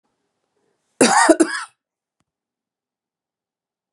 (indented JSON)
{
  "cough_length": "3.9 s",
  "cough_amplitude": 32755,
  "cough_signal_mean_std_ratio": 0.27,
  "survey_phase": "beta (2021-08-13 to 2022-03-07)",
  "age": "45-64",
  "gender": "Female",
  "wearing_mask": "No",
  "symptom_none": true,
  "smoker_status": "Never smoked",
  "respiratory_condition_asthma": false,
  "respiratory_condition_other": false,
  "recruitment_source": "REACT",
  "submission_delay": "1 day",
  "covid_test_result": "Negative",
  "covid_test_method": "RT-qPCR",
  "influenza_a_test_result": "Negative",
  "influenza_b_test_result": "Negative"
}